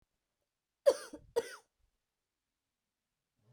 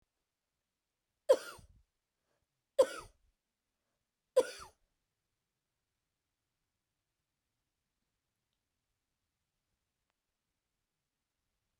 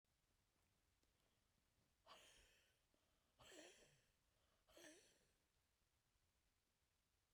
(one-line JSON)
{"cough_length": "3.5 s", "cough_amplitude": 6732, "cough_signal_mean_std_ratio": 0.17, "three_cough_length": "11.8 s", "three_cough_amplitude": 6250, "three_cough_signal_mean_std_ratio": 0.12, "exhalation_length": "7.3 s", "exhalation_amplitude": 91, "exhalation_signal_mean_std_ratio": 0.52, "survey_phase": "beta (2021-08-13 to 2022-03-07)", "age": "45-64", "gender": "Female", "wearing_mask": "No", "symptom_none": true, "smoker_status": "Never smoked", "respiratory_condition_asthma": false, "respiratory_condition_other": false, "recruitment_source": "REACT", "submission_delay": "1 day", "covid_test_result": "Negative", "covid_test_method": "RT-qPCR"}